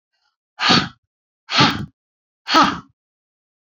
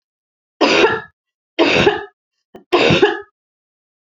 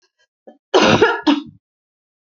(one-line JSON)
{"exhalation_length": "3.8 s", "exhalation_amplitude": 28719, "exhalation_signal_mean_std_ratio": 0.36, "three_cough_length": "4.2 s", "three_cough_amplitude": 32767, "three_cough_signal_mean_std_ratio": 0.45, "cough_length": "2.2 s", "cough_amplitude": 28707, "cough_signal_mean_std_ratio": 0.41, "survey_phase": "beta (2021-08-13 to 2022-03-07)", "age": "45-64", "gender": "Female", "wearing_mask": "No", "symptom_none": true, "smoker_status": "Never smoked", "respiratory_condition_asthma": false, "respiratory_condition_other": false, "recruitment_source": "REACT", "submission_delay": "1 day", "covid_test_result": "Negative", "covid_test_method": "RT-qPCR", "influenza_a_test_result": "Negative", "influenza_b_test_result": "Negative"}